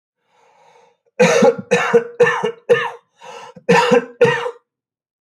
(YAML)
three_cough_length: 5.2 s
three_cough_amplitude: 26339
three_cough_signal_mean_std_ratio: 0.49
survey_phase: beta (2021-08-13 to 2022-03-07)
age: 45-64
gender: Male
wearing_mask: 'No'
symptom_cough_any: true
symptom_runny_or_blocked_nose: true
symptom_sore_throat: true
symptom_headache: true
symptom_onset: 3 days
smoker_status: Never smoked
respiratory_condition_asthma: false
respiratory_condition_other: false
recruitment_source: Test and Trace
submission_delay: 2 days
covid_test_result: Positive
covid_test_method: RT-qPCR
covid_ct_value: 35.4
covid_ct_gene: N gene